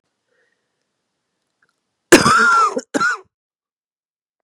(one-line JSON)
{"cough_length": "4.4 s", "cough_amplitude": 32768, "cough_signal_mean_std_ratio": 0.34, "survey_phase": "beta (2021-08-13 to 2022-03-07)", "age": "45-64", "gender": "Female", "wearing_mask": "No", "symptom_cough_any": true, "symptom_new_continuous_cough": true, "symptom_shortness_of_breath": true, "symptom_fatigue": true, "symptom_headache": true, "symptom_onset": "5 days", "smoker_status": "Prefer not to say", "respiratory_condition_asthma": false, "respiratory_condition_other": false, "recruitment_source": "Test and Trace", "submission_delay": "1 day", "covid_test_result": "Negative", "covid_test_method": "RT-qPCR"}